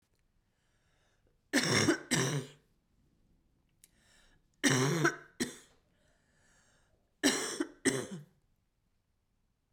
three_cough_length: 9.7 s
three_cough_amplitude: 6962
three_cough_signal_mean_std_ratio: 0.36
survey_phase: beta (2021-08-13 to 2022-03-07)
age: 18-44
gender: Female
wearing_mask: 'No'
symptom_cough_any: true
symptom_runny_or_blocked_nose: true
symptom_fatigue: true
symptom_fever_high_temperature: true
symptom_headache: true
symptom_change_to_sense_of_smell_or_taste: true
symptom_loss_of_taste: true
symptom_other: true
symptom_onset: 4 days
smoker_status: Ex-smoker
respiratory_condition_asthma: false
respiratory_condition_other: false
recruitment_source: Test and Trace
submission_delay: 2 days
covid_test_result: Positive
covid_test_method: RT-qPCR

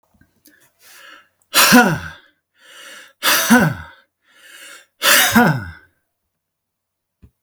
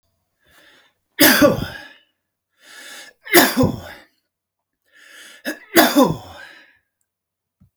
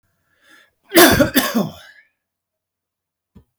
exhalation_length: 7.4 s
exhalation_amplitude: 32768
exhalation_signal_mean_std_ratio: 0.38
three_cough_length: 7.8 s
three_cough_amplitude: 32768
three_cough_signal_mean_std_ratio: 0.33
cough_length: 3.6 s
cough_amplitude: 32768
cough_signal_mean_std_ratio: 0.32
survey_phase: beta (2021-08-13 to 2022-03-07)
age: 45-64
gender: Male
wearing_mask: 'No'
symptom_none: true
smoker_status: Ex-smoker
respiratory_condition_asthma: false
respiratory_condition_other: false
recruitment_source: REACT
submission_delay: 4 days
covid_test_result: Negative
covid_test_method: RT-qPCR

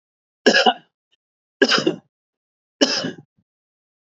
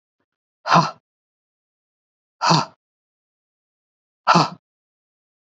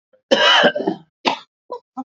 three_cough_length: 4.1 s
three_cough_amplitude: 27648
three_cough_signal_mean_std_ratio: 0.33
exhalation_length: 5.5 s
exhalation_amplitude: 27450
exhalation_signal_mean_std_ratio: 0.26
cough_length: 2.1 s
cough_amplitude: 27865
cough_signal_mean_std_ratio: 0.47
survey_phase: beta (2021-08-13 to 2022-03-07)
age: 45-64
gender: Male
wearing_mask: 'No'
symptom_none: true
smoker_status: Ex-smoker
respiratory_condition_asthma: false
respiratory_condition_other: false
recruitment_source: REACT
submission_delay: 2 days
covid_test_result: Negative
covid_test_method: RT-qPCR
influenza_a_test_result: Negative
influenza_b_test_result: Negative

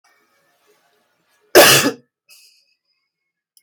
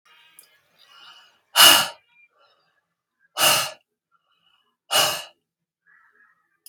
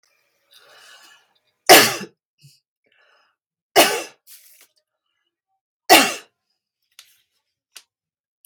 cough_length: 3.6 s
cough_amplitude: 32768
cough_signal_mean_std_ratio: 0.25
exhalation_length: 6.7 s
exhalation_amplitude: 32767
exhalation_signal_mean_std_ratio: 0.27
three_cough_length: 8.5 s
three_cough_amplitude: 32768
three_cough_signal_mean_std_ratio: 0.22
survey_phase: beta (2021-08-13 to 2022-03-07)
age: 45-64
gender: Female
wearing_mask: 'No'
symptom_none: true
smoker_status: Never smoked
respiratory_condition_asthma: false
respiratory_condition_other: false
recruitment_source: REACT
submission_delay: 0 days
covid_test_result: Negative
covid_test_method: RT-qPCR
influenza_a_test_result: Negative
influenza_b_test_result: Negative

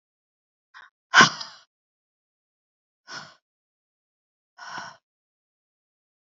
exhalation_length: 6.3 s
exhalation_amplitude: 30197
exhalation_signal_mean_std_ratio: 0.15
survey_phase: beta (2021-08-13 to 2022-03-07)
age: 18-44
gender: Female
wearing_mask: 'No'
symptom_cough_any: true
symptom_fatigue: true
symptom_headache: true
symptom_onset: 6 days
smoker_status: Never smoked
respiratory_condition_asthma: false
respiratory_condition_other: false
recruitment_source: Test and Trace
submission_delay: 1 day
covid_test_result: Positive
covid_test_method: ePCR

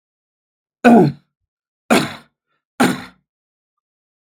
three_cough_length: 4.4 s
three_cough_amplitude: 32767
three_cough_signal_mean_std_ratio: 0.29
survey_phase: beta (2021-08-13 to 2022-03-07)
age: 18-44
gender: Male
wearing_mask: 'No'
symptom_none: true
smoker_status: Never smoked
respiratory_condition_asthma: false
respiratory_condition_other: false
recruitment_source: REACT
submission_delay: 2 days
covid_test_result: Negative
covid_test_method: RT-qPCR
influenza_a_test_result: Negative
influenza_b_test_result: Negative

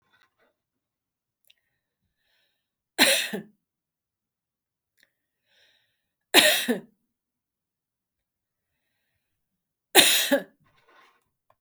three_cough_length: 11.6 s
three_cough_amplitude: 32323
three_cough_signal_mean_std_ratio: 0.23
survey_phase: beta (2021-08-13 to 2022-03-07)
age: 45-64
gender: Female
wearing_mask: 'No'
symptom_none: true
symptom_onset: 3 days
smoker_status: Never smoked
respiratory_condition_asthma: false
respiratory_condition_other: false
recruitment_source: REACT
submission_delay: 1 day
covid_test_result: Negative
covid_test_method: RT-qPCR
influenza_a_test_result: Negative
influenza_b_test_result: Negative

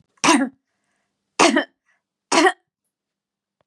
three_cough_length: 3.7 s
three_cough_amplitude: 32767
three_cough_signal_mean_std_ratio: 0.34
survey_phase: beta (2021-08-13 to 2022-03-07)
age: 65+
gender: Female
wearing_mask: 'No'
symptom_cough_any: true
symptom_runny_or_blocked_nose: true
smoker_status: Ex-smoker
respiratory_condition_asthma: false
respiratory_condition_other: false
recruitment_source: REACT
submission_delay: 2 days
covid_test_result: Negative
covid_test_method: RT-qPCR
influenza_a_test_result: Negative
influenza_b_test_result: Negative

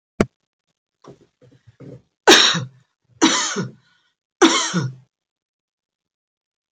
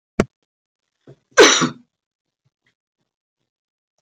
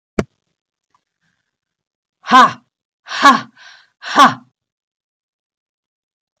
three_cough_length: 6.7 s
three_cough_amplitude: 32229
three_cough_signal_mean_std_ratio: 0.31
cough_length: 4.0 s
cough_amplitude: 30067
cough_signal_mean_std_ratio: 0.22
exhalation_length: 6.4 s
exhalation_amplitude: 32768
exhalation_signal_mean_std_ratio: 0.26
survey_phase: beta (2021-08-13 to 2022-03-07)
age: 65+
gender: Female
wearing_mask: 'No'
symptom_none: true
smoker_status: Ex-smoker
respiratory_condition_asthma: false
respiratory_condition_other: false
recruitment_source: REACT
submission_delay: 1 day
covid_test_result: Negative
covid_test_method: RT-qPCR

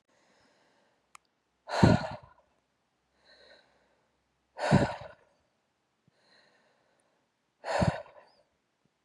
exhalation_length: 9.0 s
exhalation_amplitude: 17672
exhalation_signal_mean_std_ratio: 0.24
survey_phase: beta (2021-08-13 to 2022-03-07)
age: 18-44
gender: Female
wearing_mask: 'No'
symptom_cough_any: true
symptom_sore_throat: true
symptom_fatigue: true
symptom_onset: 2 days
smoker_status: Never smoked
respiratory_condition_asthma: false
respiratory_condition_other: false
recruitment_source: Test and Trace
submission_delay: 1 day
covid_test_result: Negative
covid_test_method: RT-qPCR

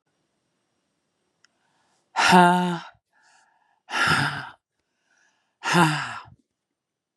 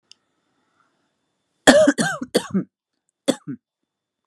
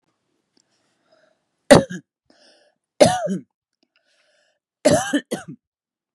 exhalation_length: 7.2 s
exhalation_amplitude: 27237
exhalation_signal_mean_std_ratio: 0.33
cough_length: 4.3 s
cough_amplitude: 32768
cough_signal_mean_std_ratio: 0.3
three_cough_length: 6.1 s
three_cough_amplitude: 32768
three_cough_signal_mean_std_ratio: 0.25
survey_phase: beta (2021-08-13 to 2022-03-07)
age: 18-44
gender: Female
wearing_mask: 'No'
symptom_cough_any: true
symptom_runny_or_blocked_nose: true
symptom_shortness_of_breath: true
symptom_sore_throat: true
symptom_fatigue: true
symptom_headache: true
symptom_other: true
symptom_onset: 0 days
smoker_status: Never smoked
respiratory_condition_asthma: false
respiratory_condition_other: false
recruitment_source: Test and Trace
submission_delay: 0 days
covid_test_result: Positive
covid_test_method: RT-qPCR
covid_ct_value: 24.9
covid_ct_gene: ORF1ab gene
covid_ct_mean: 25.0
covid_viral_load: 6300 copies/ml
covid_viral_load_category: Minimal viral load (< 10K copies/ml)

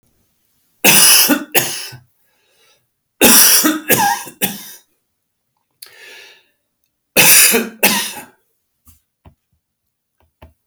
cough_length: 10.7 s
cough_amplitude: 32768
cough_signal_mean_std_ratio: 0.4
survey_phase: beta (2021-08-13 to 2022-03-07)
age: 65+
gender: Male
wearing_mask: 'No'
symptom_none: true
smoker_status: Ex-smoker
respiratory_condition_asthma: false
respiratory_condition_other: false
recruitment_source: REACT
submission_delay: 1 day
covid_test_result: Negative
covid_test_method: RT-qPCR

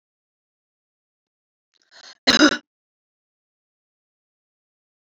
cough_length: 5.1 s
cough_amplitude: 29400
cough_signal_mean_std_ratio: 0.17
survey_phase: beta (2021-08-13 to 2022-03-07)
age: 45-64
gender: Female
wearing_mask: 'No'
symptom_none: true
smoker_status: Never smoked
respiratory_condition_asthma: false
respiratory_condition_other: false
recruitment_source: REACT
submission_delay: 1 day
covid_test_result: Negative
covid_test_method: RT-qPCR
influenza_a_test_result: Negative
influenza_b_test_result: Negative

